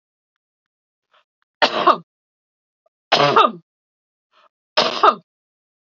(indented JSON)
{
  "three_cough_length": "6.0 s",
  "three_cough_amplitude": 30448,
  "three_cough_signal_mean_std_ratio": 0.3,
  "survey_phase": "beta (2021-08-13 to 2022-03-07)",
  "age": "45-64",
  "gender": "Female",
  "wearing_mask": "No",
  "symptom_none": true,
  "smoker_status": "Ex-smoker",
  "respiratory_condition_asthma": false,
  "respiratory_condition_other": false,
  "recruitment_source": "Test and Trace",
  "submission_delay": "1 day",
  "covid_test_result": "Positive",
  "covid_test_method": "LFT"
}